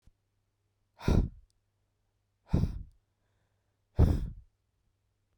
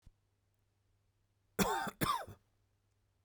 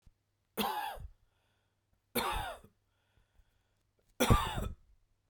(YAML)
exhalation_length: 5.4 s
exhalation_amplitude: 8537
exhalation_signal_mean_std_ratio: 0.28
cough_length: 3.2 s
cough_amplitude: 5189
cough_signal_mean_std_ratio: 0.33
three_cough_length: 5.3 s
three_cough_amplitude: 9095
three_cough_signal_mean_std_ratio: 0.35
survey_phase: beta (2021-08-13 to 2022-03-07)
age: 18-44
gender: Male
wearing_mask: 'No'
symptom_shortness_of_breath: true
symptom_abdominal_pain: true
symptom_fatigue: true
symptom_headache: true
symptom_onset: 2 days
smoker_status: Never smoked
respiratory_condition_asthma: false
respiratory_condition_other: false
recruitment_source: REACT
submission_delay: 1 day
covid_test_result: Negative
covid_test_method: RT-qPCR